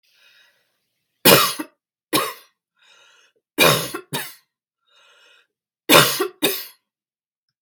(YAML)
three_cough_length: 7.6 s
three_cough_amplitude: 32768
three_cough_signal_mean_std_ratio: 0.31
survey_phase: beta (2021-08-13 to 2022-03-07)
age: 45-64
gender: Female
wearing_mask: 'No'
symptom_runny_or_blocked_nose: true
symptom_onset: 12 days
smoker_status: Ex-smoker
respiratory_condition_asthma: false
respiratory_condition_other: false
recruitment_source: REACT
submission_delay: 1 day
covid_test_result: Negative
covid_test_method: RT-qPCR
influenza_a_test_result: Negative
influenza_b_test_result: Negative